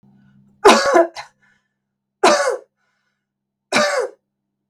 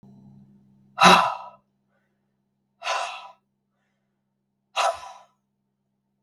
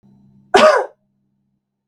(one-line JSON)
{"three_cough_length": "4.7 s", "three_cough_amplitude": 32768, "three_cough_signal_mean_std_ratio": 0.37, "exhalation_length": "6.2 s", "exhalation_amplitude": 32768, "exhalation_signal_mean_std_ratio": 0.26, "cough_length": "1.9 s", "cough_amplitude": 32768, "cough_signal_mean_std_ratio": 0.33, "survey_phase": "beta (2021-08-13 to 2022-03-07)", "age": "18-44", "gender": "Female", "wearing_mask": "No", "symptom_none": true, "smoker_status": "Never smoked", "respiratory_condition_asthma": true, "respiratory_condition_other": false, "recruitment_source": "REACT", "submission_delay": "3 days", "covid_test_result": "Negative", "covid_test_method": "RT-qPCR", "influenza_a_test_result": "Negative", "influenza_b_test_result": "Negative"}